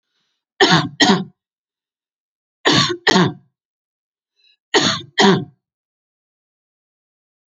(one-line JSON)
{"three_cough_length": "7.5 s", "three_cough_amplitude": 32767, "three_cough_signal_mean_std_ratio": 0.35, "survey_phase": "alpha (2021-03-01 to 2021-08-12)", "age": "45-64", "gender": "Female", "wearing_mask": "No", "symptom_none": true, "smoker_status": "Ex-smoker", "respiratory_condition_asthma": true, "respiratory_condition_other": false, "recruitment_source": "REACT", "submission_delay": "1 day", "covid_test_result": "Negative", "covid_test_method": "RT-qPCR"}